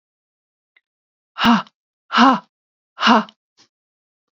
exhalation_length: 4.4 s
exhalation_amplitude: 32090
exhalation_signal_mean_std_ratio: 0.31
survey_phase: beta (2021-08-13 to 2022-03-07)
age: 45-64
gender: Female
wearing_mask: 'No'
symptom_cough_any: true
symptom_new_continuous_cough: true
symptom_runny_or_blocked_nose: true
symptom_fatigue: true
symptom_headache: true
symptom_change_to_sense_of_smell_or_taste: true
symptom_loss_of_taste: true
smoker_status: Never smoked
respiratory_condition_asthma: true
respiratory_condition_other: false
recruitment_source: Test and Trace
submission_delay: 2 days
covid_test_result: Positive
covid_test_method: ePCR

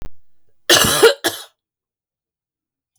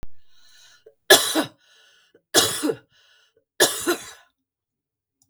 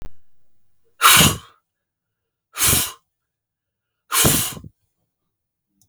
cough_length: 3.0 s
cough_amplitude: 32768
cough_signal_mean_std_ratio: 0.36
three_cough_length: 5.3 s
three_cough_amplitude: 32768
three_cough_signal_mean_std_ratio: 0.33
exhalation_length: 5.9 s
exhalation_amplitude: 32768
exhalation_signal_mean_std_ratio: 0.34
survey_phase: beta (2021-08-13 to 2022-03-07)
age: 65+
gender: Female
wearing_mask: 'No'
symptom_none: true
smoker_status: Never smoked
respiratory_condition_asthma: false
respiratory_condition_other: false
recruitment_source: REACT
submission_delay: 1 day
covid_test_result: Negative
covid_test_method: RT-qPCR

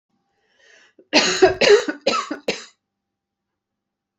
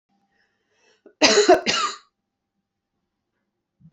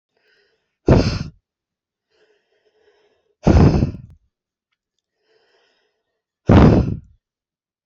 three_cough_length: 4.2 s
three_cough_amplitude: 28071
three_cough_signal_mean_std_ratio: 0.36
cough_length: 3.9 s
cough_amplitude: 32767
cough_signal_mean_std_ratio: 0.3
exhalation_length: 7.9 s
exhalation_amplitude: 28385
exhalation_signal_mean_std_ratio: 0.3
survey_phase: beta (2021-08-13 to 2022-03-07)
age: 45-64
gender: Female
wearing_mask: 'No'
symptom_headache: true
symptom_onset: 6 days
smoker_status: Never smoked
respiratory_condition_asthma: false
respiratory_condition_other: false
recruitment_source: REACT
submission_delay: 1 day
covid_test_result: Negative
covid_test_method: RT-qPCR
influenza_a_test_result: Negative
influenza_b_test_result: Negative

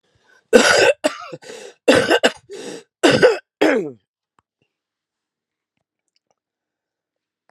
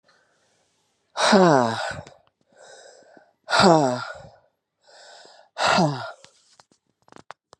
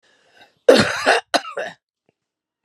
three_cough_length: 7.5 s
three_cough_amplitude: 32768
three_cough_signal_mean_std_ratio: 0.36
exhalation_length: 7.6 s
exhalation_amplitude: 26609
exhalation_signal_mean_std_ratio: 0.36
cough_length: 2.6 s
cough_amplitude: 32768
cough_signal_mean_std_ratio: 0.35
survey_phase: alpha (2021-03-01 to 2021-08-12)
age: 45-64
gender: Female
wearing_mask: 'No'
symptom_cough_any: true
symptom_fatigue: true
symptom_headache: true
symptom_loss_of_taste: true
smoker_status: Ex-smoker
respiratory_condition_asthma: false
respiratory_condition_other: true
recruitment_source: Test and Trace
submission_delay: 2 days
covid_test_result: Positive
covid_test_method: LFT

